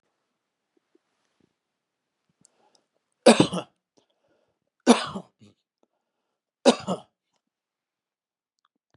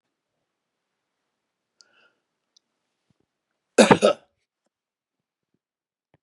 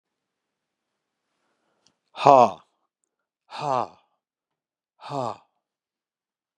{
  "three_cough_length": "9.0 s",
  "three_cough_amplitude": 26964,
  "three_cough_signal_mean_std_ratio": 0.17,
  "cough_length": "6.2 s",
  "cough_amplitude": 32767,
  "cough_signal_mean_std_ratio": 0.15,
  "exhalation_length": "6.6 s",
  "exhalation_amplitude": 32314,
  "exhalation_signal_mean_std_ratio": 0.19,
  "survey_phase": "beta (2021-08-13 to 2022-03-07)",
  "age": "65+",
  "gender": "Male",
  "wearing_mask": "No",
  "symptom_runny_or_blocked_nose": true,
  "smoker_status": "Ex-smoker",
  "respiratory_condition_asthma": false,
  "respiratory_condition_other": false,
  "recruitment_source": "REACT",
  "submission_delay": "2 days",
  "covid_test_result": "Negative",
  "covid_test_method": "RT-qPCR",
  "influenza_a_test_result": "Negative",
  "influenza_b_test_result": "Negative"
}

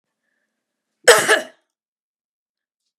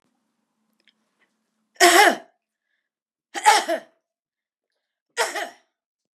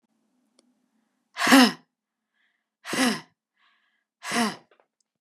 {
  "cough_length": "3.0 s",
  "cough_amplitude": 32768,
  "cough_signal_mean_std_ratio": 0.23,
  "three_cough_length": "6.1 s",
  "three_cough_amplitude": 32548,
  "three_cough_signal_mean_std_ratio": 0.28,
  "exhalation_length": "5.2 s",
  "exhalation_amplitude": 29868,
  "exhalation_signal_mean_std_ratio": 0.29,
  "survey_phase": "beta (2021-08-13 to 2022-03-07)",
  "age": "18-44",
  "gender": "Female",
  "wearing_mask": "No",
  "symptom_none": true,
  "smoker_status": "Never smoked",
  "respiratory_condition_asthma": false,
  "respiratory_condition_other": false,
  "recruitment_source": "REACT",
  "submission_delay": "3 days",
  "covid_test_result": "Negative",
  "covid_test_method": "RT-qPCR"
}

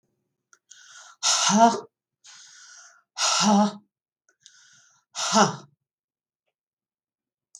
{
  "exhalation_length": "7.6 s",
  "exhalation_amplitude": 18863,
  "exhalation_signal_mean_std_ratio": 0.35,
  "survey_phase": "beta (2021-08-13 to 2022-03-07)",
  "age": "65+",
  "gender": "Female",
  "wearing_mask": "No",
  "symptom_cough_any": true,
  "symptom_onset": "6 days",
  "smoker_status": "Never smoked",
  "respiratory_condition_asthma": false,
  "respiratory_condition_other": false,
  "recruitment_source": "REACT",
  "submission_delay": "5 days",
  "covid_test_result": "Negative",
  "covid_test_method": "RT-qPCR",
  "influenza_a_test_result": "Negative",
  "influenza_b_test_result": "Negative"
}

